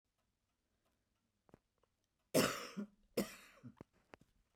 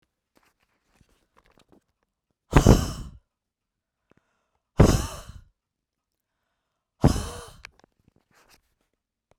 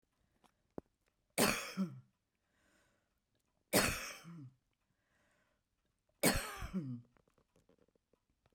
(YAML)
cough_length: 4.6 s
cough_amplitude: 3227
cough_signal_mean_std_ratio: 0.25
exhalation_length: 9.4 s
exhalation_amplitude: 29363
exhalation_signal_mean_std_ratio: 0.21
three_cough_length: 8.5 s
three_cough_amplitude: 5745
three_cough_signal_mean_std_ratio: 0.31
survey_phase: beta (2021-08-13 to 2022-03-07)
age: 65+
gender: Female
wearing_mask: 'No'
symptom_none: true
smoker_status: Never smoked
respiratory_condition_asthma: false
respiratory_condition_other: false
recruitment_source: REACT
submission_delay: 1 day
covid_test_result: Negative
covid_test_method: RT-qPCR
influenza_a_test_result: Negative
influenza_b_test_result: Negative